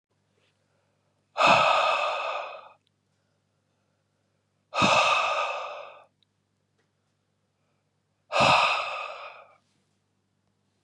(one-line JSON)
{"exhalation_length": "10.8 s", "exhalation_amplitude": 17514, "exhalation_signal_mean_std_ratio": 0.4, "survey_phase": "beta (2021-08-13 to 2022-03-07)", "age": "45-64", "gender": "Male", "wearing_mask": "No", "symptom_none": true, "smoker_status": "Never smoked", "respiratory_condition_asthma": false, "respiratory_condition_other": false, "recruitment_source": "REACT", "submission_delay": "1 day", "covid_test_result": "Negative", "covid_test_method": "RT-qPCR", "influenza_a_test_result": "Negative", "influenza_b_test_result": "Negative"}